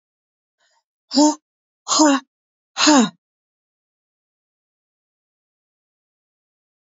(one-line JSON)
{"exhalation_length": "6.8 s", "exhalation_amplitude": 27256, "exhalation_signal_mean_std_ratio": 0.27, "survey_phase": "beta (2021-08-13 to 2022-03-07)", "age": "45-64", "gender": "Female", "wearing_mask": "No", "symptom_none": true, "symptom_onset": "12 days", "smoker_status": "Never smoked", "respiratory_condition_asthma": false, "respiratory_condition_other": false, "recruitment_source": "REACT", "submission_delay": "1 day", "covid_test_result": "Negative", "covid_test_method": "RT-qPCR"}